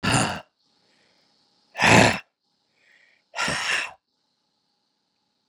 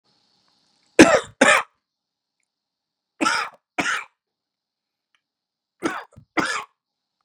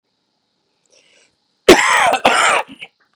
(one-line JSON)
{"exhalation_length": "5.5 s", "exhalation_amplitude": 30462, "exhalation_signal_mean_std_ratio": 0.32, "three_cough_length": "7.2 s", "three_cough_amplitude": 32768, "three_cough_signal_mean_std_ratio": 0.26, "cough_length": "3.2 s", "cough_amplitude": 32768, "cough_signal_mean_std_ratio": 0.4, "survey_phase": "beta (2021-08-13 to 2022-03-07)", "age": "45-64", "gender": "Male", "wearing_mask": "No", "symptom_cough_any": true, "symptom_onset": "3 days", "smoker_status": "Never smoked", "respiratory_condition_asthma": false, "respiratory_condition_other": false, "recruitment_source": "Test and Trace", "submission_delay": "2 days", "covid_test_result": "Positive", "covid_test_method": "RT-qPCR"}